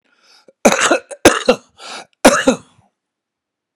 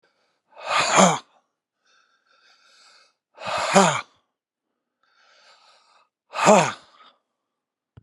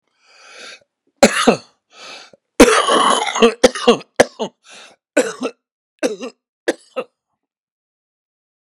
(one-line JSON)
{"cough_length": "3.8 s", "cough_amplitude": 32768, "cough_signal_mean_std_ratio": 0.35, "exhalation_length": "8.0 s", "exhalation_amplitude": 30680, "exhalation_signal_mean_std_ratio": 0.3, "three_cough_length": "8.8 s", "three_cough_amplitude": 32768, "three_cough_signal_mean_std_ratio": 0.34, "survey_phase": "beta (2021-08-13 to 2022-03-07)", "age": "65+", "gender": "Male", "wearing_mask": "No", "symptom_cough_any": true, "symptom_runny_or_blocked_nose": true, "symptom_sore_throat": true, "symptom_fatigue": true, "symptom_headache": true, "symptom_onset": "12 days", "smoker_status": "Ex-smoker", "respiratory_condition_asthma": false, "respiratory_condition_other": false, "recruitment_source": "REACT", "submission_delay": "3 days", "covid_test_result": "Negative", "covid_test_method": "RT-qPCR", "influenza_a_test_result": "Negative", "influenza_b_test_result": "Negative"}